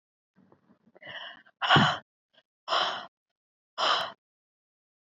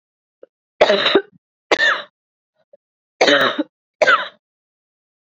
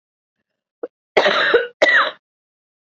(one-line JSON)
{"exhalation_length": "5.0 s", "exhalation_amplitude": 13015, "exhalation_signal_mean_std_ratio": 0.34, "three_cough_length": "5.2 s", "three_cough_amplitude": 32768, "three_cough_signal_mean_std_ratio": 0.39, "cough_length": "3.0 s", "cough_amplitude": 27773, "cough_signal_mean_std_ratio": 0.42, "survey_phase": "beta (2021-08-13 to 2022-03-07)", "age": "18-44", "gender": "Female", "wearing_mask": "No", "symptom_cough_any": true, "symptom_runny_or_blocked_nose": true, "symptom_shortness_of_breath": true, "symptom_sore_throat": true, "symptom_fatigue": true, "symptom_headache": true, "symptom_onset": "4 days", "smoker_status": "Never smoked", "respiratory_condition_asthma": true, "respiratory_condition_other": false, "recruitment_source": "Test and Trace", "submission_delay": "1 day", "covid_test_result": "Positive", "covid_test_method": "ePCR"}